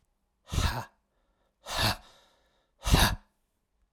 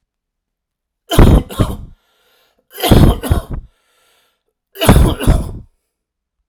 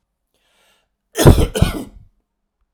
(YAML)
exhalation_length: 3.9 s
exhalation_amplitude: 12316
exhalation_signal_mean_std_ratio: 0.35
three_cough_length: 6.5 s
three_cough_amplitude: 32768
three_cough_signal_mean_std_ratio: 0.39
cough_length: 2.7 s
cough_amplitude: 32768
cough_signal_mean_std_ratio: 0.31
survey_phase: alpha (2021-03-01 to 2021-08-12)
age: 45-64
gender: Male
wearing_mask: 'No'
symptom_none: true
smoker_status: Never smoked
respiratory_condition_asthma: false
respiratory_condition_other: false
recruitment_source: REACT
submission_delay: 1 day
covid_test_result: Negative
covid_test_method: RT-qPCR